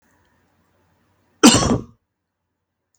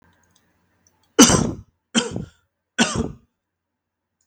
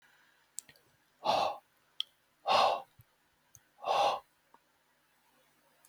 {"cough_length": "3.0 s", "cough_amplitude": 32768, "cough_signal_mean_std_ratio": 0.25, "three_cough_length": "4.3 s", "three_cough_amplitude": 32768, "three_cough_signal_mean_std_ratio": 0.29, "exhalation_length": "5.9 s", "exhalation_amplitude": 6113, "exhalation_signal_mean_std_ratio": 0.34, "survey_phase": "beta (2021-08-13 to 2022-03-07)", "age": "18-44", "gender": "Male", "wearing_mask": "No", "symptom_none": true, "smoker_status": "Never smoked", "respiratory_condition_asthma": false, "respiratory_condition_other": false, "recruitment_source": "REACT", "submission_delay": "1 day", "covid_test_result": "Negative", "covid_test_method": "RT-qPCR", "influenza_a_test_result": "Negative", "influenza_b_test_result": "Negative"}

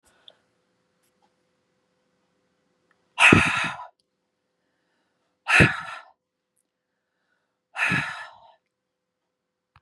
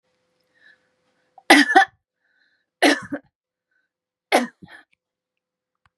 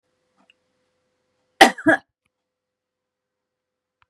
{"exhalation_length": "9.8 s", "exhalation_amplitude": 32692, "exhalation_signal_mean_std_ratio": 0.25, "three_cough_length": "6.0 s", "three_cough_amplitude": 32669, "three_cough_signal_mean_std_ratio": 0.25, "cough_length": "4.1 s", "cough_amplitude": 32768, "cough_signal_mean_std_ratio": 0.16, "survey_phase": "beta (2021-08-13 to 2022-03-07)", "age": "65+", "gender": "Female", "wearing_mask": "No", "symptom_none": true, "smoker_status": "Never smoked", "respiratory_condition_asthma": false, "respiratory_condition_other": false, "recruitment_source": "REACT", "submission_delay": "3 days", "covid_test_result": "Negative", "covid_test_method": "RT-qPCR", "influenza_a_test_result": "Negative", "influenza_b_test_result": "Negative"}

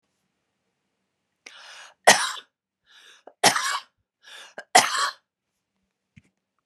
{"three_cough_length": "6.7 s", "three_cough_amplitude": 32663, "three_cough_signal_mean_std_ratio": 0.25, "survey_phase": "beta (2021-08-13 to 2022-03-07)", "age": "45-64", "gender": "Female", "wearing_mask": "No", "symptom_none": true, "smoker_status": "Never smoked", "respiratory_condition_asthma": true, "respiratory_condition_other": false, "recruitment_source": "REACT", "submission_delay": "1 day", "covid_test_result": "Negative", "covid_test_method": "RT-qPCR"}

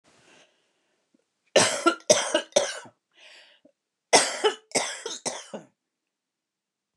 {"cough_length": "7.0 s", "cough_amplitude": 24182, "cough_signal_mean_std_ratio": 0.33, "survey_phase": "beta (2021-08-13 to 2022-03-07)", "age": "65+", "gender": "Female", "wearing_mask": "No", "symptom_none": true, "smoker_status": "Ex-smoker", "respiratory_condition_asthma": false, "respiratory_condition_other": false, "recruitment_source": "REACT", "submission_delay": "2 days", "covid_test_result": "Negative", "covid_test_method": "RT-qPCR", "influenza_a_test_result": "Negative", "influenza_b_test_result": "Negative"}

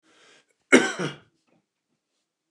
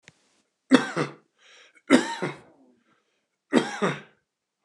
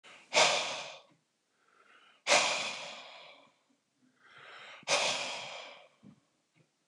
{"cough_length": "2.5 s", "cough_amplitude": 28337, "cough_signal_mean_std_ratio": 0.23, "three_cough_length": "4.6 s", "three_cough_amplitude": 28171, "three_cough_signal_mean_std_ratio": 0.31, "exhalation_length": "6.9 s", "exhalation_amplitude": 9050, "exhalation_signal_mean_std_ratio": 0.39, "survey_phase": "beta (2021-08-13 to 2022-03-07)", "age": "45-64", "gender": "Male", "wearing_mask": "No", "symptom_cough_any": true, "smoker_status": "Ex-smoker", "respiratory_condition_asthma": false, "respiratory_condition_other": false, "recruitment_source": "Test and Trace", "submission_delay": "2 days", "covid_test_result": "Positive", "covid_test_method": "RT-qPCR", "covid_ct_value": 30.0, "covid_ct_gene": "ORF1ab gene", "covid_ct_mean": 31.2, "covid_viral_load": "59 copies/ml", "covid_viral_load_category": "Minimal viral load (< 10K copies/ml)"}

